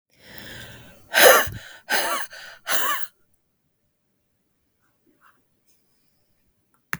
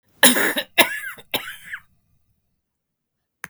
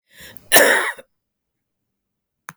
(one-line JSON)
{"exhalation_length": "7.0 s", "exhalation_amplitude": 32768, "exhalation_signal_mean_std_ratio": 0.3, "three_cough_length": "3.5 s", "three_cough_amplitude": 32768, "three_cough_signal_mean_std_ratio": 0.32, "cough_length": "2.6 s", "cough_amplitude": 32768, "cough_signal_mean_std_ratio": 0.3, "survey_phase": "beta (2021-08-13 to 2022-03-07)", "age": "45-64", "gender": "Female", "wearing_mask": "No", "symptom_cough_any": true, "symptom_runny_or_blocked_nose": true, "symptom_shortness_of_breath": true, "symptom_sore_throat": true, "symptom_headache": true, "symptom_onset": "13 days", "smoker_status": "Never smoked", "respiratory_condition_asthma": true, "respiratory_condition_other": false, "recruitment_source": "REACT", "submission_delay": "2 days", "covid_test_result": "Negative", "covid_test_method": "RT-qPCR"}